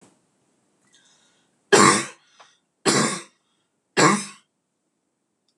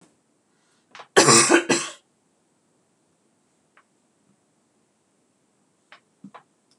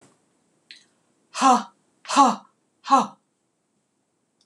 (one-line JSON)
{"three_cough_length": "5.6 s", "three_cough_amplitude": 26028, "three_cough_signal_mean_std_ratio": 0.3, "cough_length": "6.8 s", "cough_amplitude": 26027, "cough_signal_mean_std_ratio": 0.23, "exhalation_length": "4.5 s", "exhalation_amplitude": 23282, "exhalation_signal_mean_std_ratio": 0.3, "survey_phase": "beta (2021-08-13 to 2022-03-07)", "age": "45-64", "gender": "Female", "wearing_mask": "No", "symptom_none": true, "smoker_status": "Never smoked", "respiratory_condition_asthma": false, "respiratory_condition_other": false, "recruitment_source": "REACT", "submission_delay": "1 day", "covid_test_result": "Negative", "covid_test_method": "RT-qPCR"}